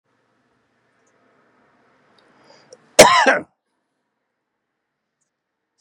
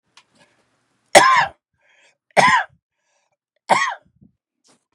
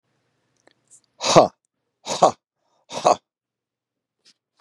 cough_length: 5.8 s
cough_amplitude: 32768
cough_signal_mean_std_ratio: 0.19
three_cough_length: 4.9 s
three_cough_amplitude: 32768
three_cough_signal_mean_std_ratio: 0.31
exhalation_length: 4.6 s
exhalation_amplitude: 32768
exhalation_signal_mean_std_ratio: 0.24
survey_phase: beta (2021-08-13 to 2022-03-07)
age: 45-64
gender: Male
wearing_mask: 'No'
symptom_none: true
smoker_status: Current smoker (1 to 10 cigarettes per day)
respiratory_condition_asthma: false
respiratory_condition_other: false
recruitment_source: REACT
submission_delay: 1 day
covid_test_result: Negative
covid_test_method: RT-qPCR
influenza_a_test_result: Negative
influenza_b_test_result: Negative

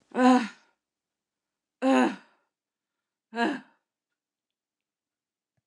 exhalation_length: 5.7 s
exhalation_amplitude: 14756
exhalation_signal_mean_std_ratio: 0.28
survey_phase: beta (2021-08-13 to 2022-03-07)
age: 65+
gender: Female
wearing_mask: 'No'
symptom_none: true
smoker_status: Never smoked
respiratory_condition_asthma: false
respiratory_condition_other: false
recruitment_source: REACT
submission_delay: 2 days
covid_test_result: Positive
covid_test_method: RT-qPCR
covid_ct_value: 25.4
covid_ct_gene: N gene
influenza_a_test_result: Negative
influenza_b_test_result: Negative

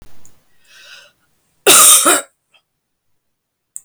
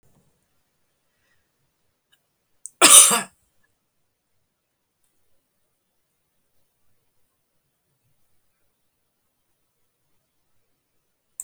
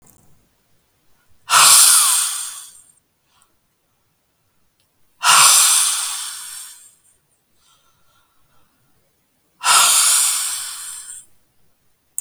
cough_length: 3.8 s
cough_amplitude: 32768
cough_signal_mean_std_ratio: 0.33
three_cough_length: 11.4 s
three_cough_amplitude: 32768
three_cough_signal_mean_std_ratio: 0.14
exhalation_length: 12.2 s
exhalation_amplitude: 32768
exhalation_signal_mean_std_ratio: 0.4
survey_phase: beta (2021-08-13 to 2022-03-07)
age: 45-64
gender: Female
wearing_mask: 'No'
symptom_cough_any: true
symptom_runny_or_blocked_nose: true
symptom_shortness_of_breath: true
symptom_diarrhoea: true
symptom_fatigue: true
symptom_headache: true
symptom_onset: 5 days
smoker_status: Never smoked
respiratory_condition_asthma: false
respiratory_condition_other: false
recruitment_source: Test and Trace
submission_delay: 2 days
covid_test_result: Positive
covid_test_method: ePCR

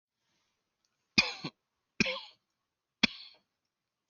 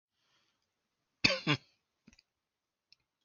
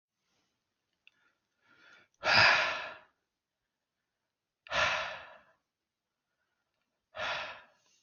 three_cough_length: 4.1 s
three_cough_amplitude: 12628
three_cough_signal_mean_std_ratio: 0.21
cough_length: 3.2 s
cough_amplitude: 15420
cough_signal_mean_std_ratio: 0.2
exhalation_length: 8.0 s
exhalation_amplitude: 10092
exhalation_signal_mean_std_ratio: 0.3
survey_phase: alpha (2021-03-01 to 2021-08-12)
age: 18-44
gender: Male
wearing_mask: 'No'
symptom_none: true
smoker_status: Never smoked
respiratory_condition_asthma: false
respiratory_condition_other: false
recruitment_source: REACT
submission_delay: 7 days
covid_test_result: Negative
covid_test_method: RT-qPCR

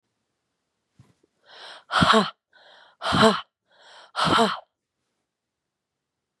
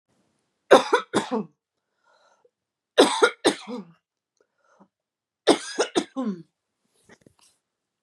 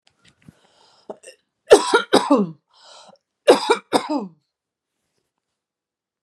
exhalation_length: 6.4 s
exhalation_amplitude: 27314
exhalation_signal_mean_std_ratio: 0.32
three_cough_length: 8.0 s
three_cough_amplitude: 31206
three_cough_signal_mean_std_ratio: 0.28
cough_length: 6.2 s
cough_amplitude: 32768
cough_signal_mean_std_ratio: 0.29
survey_phase: beta (2021-08-13 to 2022-03-07)
age: 18-44
gender: Female
wearing_mask: 'No'
symptom_none: true
smoker_status: Ex-smoker
respiratory_condition_asthma: false
respiratory_condition_other: false
recruitment_source: REACT
submission_delay: 2 days
covid_test_result: Negative
covid_test_method: RT-qPCR
influenza_a_test_result: Negative
influenza_b_test_result: Negative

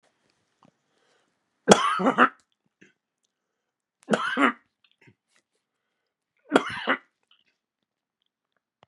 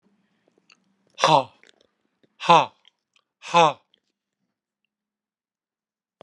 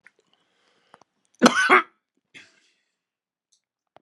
three_cough_length: 8.9 s
three_cough_amplitude: 32768
three_cough_signal_mean_std_ratio: 0.24
exhalation_length: 6.2 s
exhalation_amplitude: 28598
exhalation_signal_mean_std_ratio: 0.23
cough_length: 4.0 s
cough_amplitude: 32744
cough_signal_mean_std_ratio: 0.22
survey_phase: beta (2021-08-13 to 2022-03-07)
age: 65+
gender: Male
wearing_mask: 'No'
symptom_cough_any: true
symptom_sore_throat: true
symptom_fatigue: true
smoker_status: Ex-smoker
respiratory_condition_asthma: false
respiratory_condition_other: false
recruitment_source: Test and Trace
submission_delay: 1 day
covid_test_result: Positive
covid_test_method: LFT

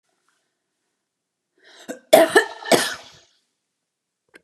cough_length: 4.4 s
cough_amplitude: 32767
cough_signal_mean_std_ratio: 0.25
survey_phase: alpha (2021-03-01 to 2021-08-12)
age: 65+
gender: Female
wearing_mask: 'No'
symptom_none: true
smoker_status: Never smoked
respiratory_condition_asthma: false
respiratory_condition_other: false
recruitment_source: REACT
submission_delay: 3 days
covid_test_result: Negative
covid_test_method: RT-qPCR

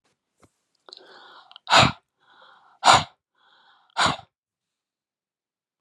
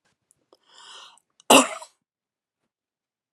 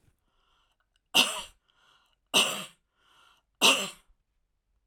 exhalation_length: 5.8 s
exhalation_amplitude: 32413
exhalation_signal_mean_std_ratio: 0.24
cough_length: 3.3 s
cough_amplitude: 30337
cough_signal_mean_std_ratio: 0.18
three_cough_length: 4.9 s
three_cough_amplitude: 15332
three_cough_signal_mean_std_ratio: 0.28
survey_phase: alpha (2021-03-01 to 2021-08-12)
age: 45-64
gender: Female
wearing_mask: 'No'
symptom_none: true
smoker_status: Ex-smoker
respiratory_condition_asthma: false
respiratory_condition_other: false
recruitment_source: REACT
submission_delay: 1 day
covid_test_result: Negative
covid_test_method: RT-qPCR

